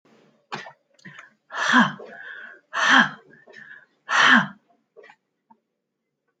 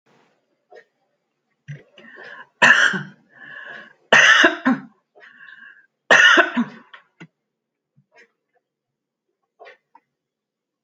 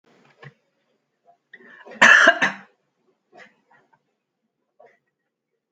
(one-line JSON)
{"exhalation_length": "6.4 s", "exhalation_amplitude": 25237, "exhalation_signal_mean_std_ratio": 0.35, "three_cough_length": "10.8 s", "three_cough_amplitude": 32228, "three_cough_signal_mean_std_ratio": 0.3, "cough_length": "5.7 s", "cough_amplitude": 31605, "cough_signal_mean_std_ratio": 0.22, "survey_phase": "alpha (2021-03-01 to 2021-08-12)", "age": "65+", "gender": "Female", "wearing_mask": "No", "symptom_none": true, "smoker_status": "Never smoked", "respiratory_condition_asthma": false, "respiratory_condition_other": false, "recruitment_source": "REACT", "submission_delay": "1 day", "covid_test_result": "Negative", "covid_test_method": "RT-qPCR"}